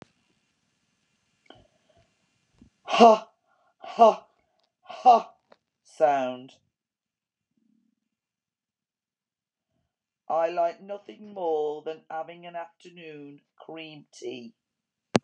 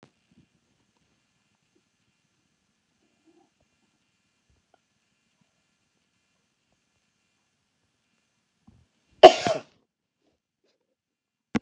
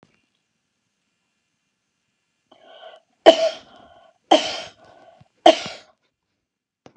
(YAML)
exhalation_length: 15.2 s
exhalation_amplitude: 23411
exhalation_signal_mean_std_ratio: 0.27
cough_length: 11.6 s
cough_amplitude: 32768
cough_signal_mean_std_ratio: 0.09
three_cough_length: 7.0 s
three_cough_amplitude: 32768
three_cough_signal_mean_std_ratio: 0.2
survey_phase: alpha (2021-03-01 to 2021-08-12)
age: 65+
gender: Female
wearing_mask: 'No'
symptom_none: true
smoker_status: Never smoked
respiratory_condition_asthma: false
respiratory_condition_other: false
recruitment_source: REACT
submission_delay: 1 day
covid_test_result: Negative
covid_test_method: RT-qPCR